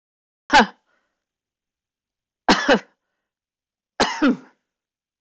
{"three_cough_length": "5.2 s", "three_cough_amplitude": 19533, "three_cough_signal_mean_std_ratio": 0.29, "survey_phase": "beta (2021-08-13 to 2022-03-07)", "age": "65+", "gender": "Female", "wearing_mask": "No", "symptom_none": true, "smoker_status": "Never smoked", "respiratory_condition_asthma": true, "respiratory_condition_other": false, "recruitment_source": "REACT", "submission_delay": "7 days", "covid_test_result": "Negative", "covid_test_method": "RT-qPCR", "influenza_a_test_result": "Negative", "influenza_b_test_result": "Negative"}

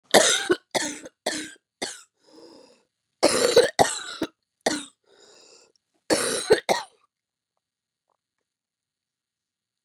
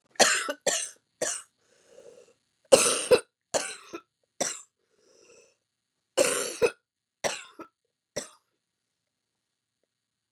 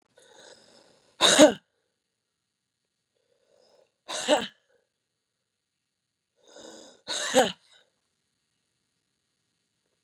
{"cough_length": "9.8 s", "cough_amplitude": 29341, "cough_signal_mean_std_ratio": 0.33, "three_cough_length": "10.3 s", "three_cough_amplitude": 26105, "three_cough_signal_mean_std_ratio": 0.3, "exhalation_length": "10.0 s", "exhalation_amplitude": 27289, "exhalation_signal_mean_std_ratio": 0.21, "survey_phase": "beta (2021-08-13 to 2022-03-07)", "age": "45-64", "gender": "Female", "wearing_mask": "No", "symptom_cough_any": true, "symptom_runny_or_blocked_nose": true, "symptom_sore_throat": true, "symptom_fatigue": true, "symptom_headache": true, "symptom_onset": "4 days", "smoker_status": "Never smoked", "respiratory_condition_asthma": true, "respiratory_condition_other": false, "recruitment_source": "Test and Trace", "submission_delay": "4 days", "covid_test_result": "Positive", "covid_test_method": "RT-qPCR"}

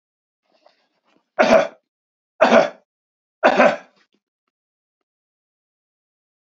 {"three_cough_length": "6.6 s", "three_cough_amplitude": 29543, "three_cough_signal_mean_std_ratio": 0.28, "survey_phase": "beta (2021-08-13 to 2022-03-07)", "age": "45-64", "gender": "Male", "wearing_mask": "No", "symptom_shortness_of_breath": true, "symptom_fatigue": true, "symptom_headache": true, "symptom_other": true, "smoker_status": "Never smoked", "respiratory_condition_asthma": false, "respiratory_condition_other": false, "recruitment_source": "Test and Trace", "submission_delay": "2 days", "covid_test_result": "Positive", "covid_test_method": "RT-qPCR", "covid_ct_value": 31.6, "covid_ct_gene": "N gene", "covid_ct_mean": 31.7, "covid_viral_load": "39 copies/ml", "covid_viral_load_category": "Minimal viral load (< 10K copies/ml)"}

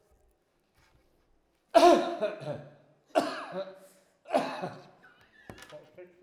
{"three_cough_length": "6.2 s", "three_cough_amplitude": 13569, "three_cough_signal_mean_std_ratio": 0.32, "survey_phase": "alpha (2021-03-01 to 2021-08-12)", "age": "65+", "gender": "Male", "wearing_mask": "No", "symptom_none": true, "smoker_status": "Never smoked", "respiratory_condition_asthma": false, "respiratory_condition_other": false, "recruitment_source": "REACT", "submission_delay": "2 days", "covid_test_result": "Negative", "covid_test_method": "RT-qPCR"}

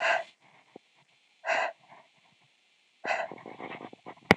{"exhalation_length": "4.4 s", "exhalation_amplitude": 26028, "exhalation_signal_mean_std_ratio": 0.32, "survey_phase": "beta (2021-08-13 to 2022-03-07)", "age": "18-44", "gender": "Female", "wearing_mask": "No", "symptom_cough_any": true, "symptom_runny_or_blocked_nose": true, "symptom_sore_throat": true, "smoker_status": "Never smoked", "respiratory_condition_asthma": false, "respiratory_condition_other": false, "recruitment_source": "Test and Trace", "submission_delay": "1 day", "covid_test_result": "Positive", "covid_test_method": "RT-qPCR"}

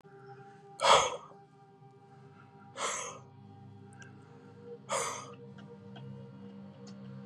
{"exhalation_length": "7.3 s", "exhalation_amplitude": 11416, "exhalation_signal_mean_std_ratio": 0.37, "survey_phase": "beta (2021-08-13 to 2022-03-07)", "age": "18-44", "gender": "Male", "wearing_mask": "No", "symptom_none": true, "smoker_status": "Never smoked", "respiratory_condition_asthma": true, "respiratory_condition_other": false, "recruitment_source": "REACT", "submission_delay": "4 days", "covid_test_result": "Negative", "covid_test_method": "RT-qPCR", "influenza_a_test_result": "Negative", "influenza_b_test_result": "Negative"}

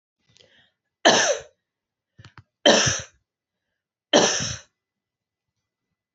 {"three_cough_length": "6.1 s", "three_cough_amplitude": 27842, "three_cough_signal_mean_std_ratio": 0.31, "survey_phase": "alpha (2021-03-01 to 2021-08-12)", "age": "18-44", "gender": "Female", "wearing_mask": "No", "symptom_fatigue": true, "symptom_headache": true, "symptom_change_to_sense_of_smell_or_taste": true, "symptom_loss_of_taste": true, "symptom_onset": "3 days", "smoker_status": "Never smoked", "respiratory_condition_asthma": false, "respiratory_condition_other": false, "recruitment_source": "Test and Trace", "submission_delay": "2 days", "covid_test_result": "Positive", "covid_test_method": "RT-qPCR", "covid_ct_value": 18.9, "covid_ct_gene": "ORF1ab gene", "covid_ct_mean": 19.0, "covid_viral_load": "570000 copies/ml", "covid_viral_load_category": "Low viral load (10K-1M copies/ml)"}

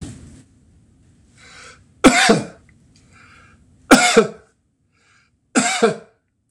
{"three_cough_length": "6.5 s", "three_cough_amplitude": 26028, "three_cough_signal_mean_std_ratio": 0.33, "survey_phase": "beta (2021-08-13 to 2022-03-07)", "age": "65+", "gender": "Male", "wearing_mask": "No", "symptom_none": true, "smoker_status": "Never smoked", "respiratory_condition_asthma": true, "respiratory_condition_other": false, "recruitment_source": "REACT", "submission_delay": "1 day", "covid_test_result": "Negative", "covid_test_method": "RT-qPCR", "influenza_a_test_result": "Negative", "influenza_b_test_result": "Negative"}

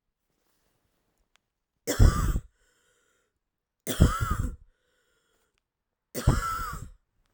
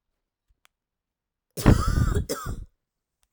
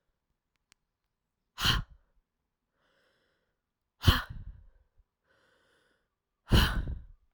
{"three_cough_length": "7.3 s", "three_cough_amplitude": 19340, "three_cough_signal_mean_std_ratio": 0.31, "cough_length": "3.3 s", "cough_amplitude": 21177, "cough_signal_mean_std_ratio": 0.35, "exhalation_length": "7.3 s", "exhalation_amplitude": 12093, "exhalation_signal_mean_std_ratio": 0.26, "survey_phase": "beta (2021-08-13 to 2022-03-07)", "age": "18-44", "gender": "Female", "wearing_mask": "No", "symptom_cough_any": true, "symptom_runny_or_blocked_nose": true, "symptom_sore_throat": true, "symptom_fatigue": true, "symptom_onset": "3 days", "smoker_status": "Never smoked", "respiratory_condition_asthma": false, "respiratory_condition_other": false, "recruitment_source": "Test and Trace", "submission_delay": "1 day", "covid_test_result": "Positive", "covid_test_method": "RT-qPCR", "covid_ct_value": 15.6, "covid_ct_gene": "ORF1ab gene", "covid_ct_mean": 15.9, "covid_viral_load": "6200000 copies/ml", "covid_viral_load_category": "High viral load (>1M copies/ml)"}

